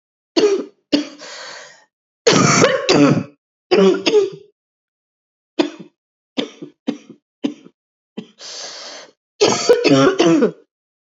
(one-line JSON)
{"cough_length": "11.0 s", "cough_amplitude": 30899, "cough_signal_mean_std_ratio": 0.47, "survey_phase": "beta (2021-08-13 to 2022-03-07)", "age": "45-64", "gender": "Female", "wearing_mask": "Yes", "symptom_cough_any": true, "symptom_runny_or_blocked_nose": true, "symptom_fatigue": true, "symptom_fever_high_temperature": true, "symptom_headache": true, "symptom_change_to_sense_of_smell_or_taste": true, "symptom_onset": "3 days", "smoker_status": "Never smoked", "respiratory_condition_asthma": false, "respiratory_condition_other": false, "recruitment_source": "Test and Trace", "submission_delay": "2 days", "covid_test_result": "Positive", "covid_test_method": "RT-qPCR", "covid_ct_value": 25.2, "covid_ct_gene": "ORF1ab gene", "covid_ct_mean": 25.5, "covid_viral_load": "4400 copies/ml", "covid_viral_load_category": "Minimal viral load (< 10K copies/ml)"}